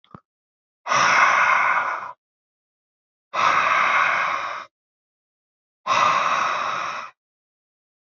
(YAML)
exhalation_length: 8.1 s
exhalation_amplitude: 21223
exhalation_signal_mean_std_ratio: 0.57
survey_phase: beta (2021-08-13 to 2022-03-07)
age: 18-44
gender: Male
wearing_mask: 'No'
symptom_none: true
smoker_status: Never smoked
respiratory_condition_asthma: false
respiratory_condition_other: false
recruitment_source: REACT
submission_delay: 1 day
covid_test_result: Negative
covid_test_method: RT-qPCR
influenza_a_test_result: Negative
influenza_b_test_result: Negative